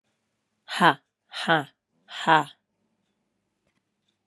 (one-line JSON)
{"exhalation_length": "4.3 s", "exhalation_amplitude": 25302, "exhalation_signal_mean_std_ratio": 0.26, "survey_phase": "beta (2021-08-13 to 2022-03-07)", "age": "18-44", "gender": "Female", "wearing_mask": "No", "symptom_cough_any": true, "symptom_new_continuous_cough": true, "symptom_runny_or_blocked_nose": true, "symptom_shortness_of_breath": true, "symptom_sore_throat": true, "symptom_fatigue": true, "symptom_fever_high_temperature": true, "symptom_headache": true, "symptom_change_to_sense_of_smell_or_taste": true, "symptom_loss_of_taste": true, "symptom_onset": "5 days", "smoker_status": "Never smoked", "respiratory_condition_asthma": false, "respiratory_condition_other": false, "recruitment_source": "Test and Trace", "submission_delay": "2 days", "covid_test_result": "Positive", "covid_test_method": "RT-qPCR", "covid_ct_value": 23.1, "covid_ct_gene": "ORF1ab gene"}